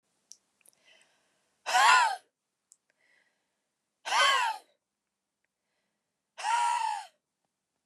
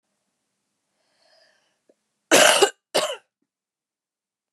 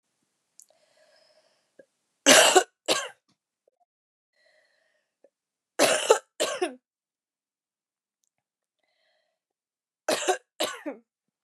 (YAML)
exhalation_length: 7.9 s
exhalation_amplitude: 12208
exhalation_signal_mean_std_ratio: 0.35
cough_length: 4.5 s
cough_amplitude: 32767
cough_signal_mean_std_ratio: 0.26
three_cough_length: 11.4 s
three_cough_amplitude: 27920
three_cough_signal_mean_std_ratio: 0.25
survey_phase: beta (2021-08-13 to 2022-03-07)
age: 18-44
gender: Female
wearing_mask: 'No'
symptom_cough_any: true
symptom_sore_throat: true
symptom_fatigue: true
symptom_headache: true
symptom_other: true
symptom_onset: 4 days
smoker_status: Never smoked
respiratory_condition_asthma: true
respiratory_condition_other: false
recruitment_source: Test and Trace
submission_delay: 1 day
covid_test_result: Positive
covid_test_method: RT-qPCR
covid_ct_value: 19.5
covid_ct_gene: N gene
covid_ct_mean: 19.6
covid_viral_load: 360000 copies/ml
covid_viral_load_category: Low viral load (10K-1M copies/ml)